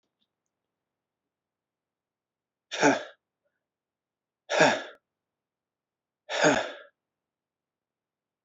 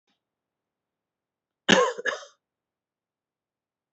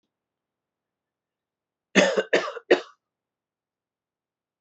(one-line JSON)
{"exhalation_length": "8.4 s", "exhalation_amplitude": 14862, "exhalation_signal_mean_std_ratio": 0.25, "cough_length": "3.9 s", "cough_amplitude": 24664, "cough_signal_mean_std_ratio": 0.22, "three_cough_length": "4.6 s", "three_cough_amplitude": 23936, "three_cough_signal_mean_std_ratio": 0.24, "survey_phase": "alpha (2021-03-01 to 2021-08-12)", "age": "18-44", "gender": "Male", "wearing_mask": "No", "symptom_none": true, "smoker_status": "Never smoked", "respiratory_condition_asthma": false, "respiratory_condition_other": false, "recruitment_source": "Test and Trace", "submission_delay": "1 day", "covid_test_result": "Negative", "covid_test_method": "LFT"}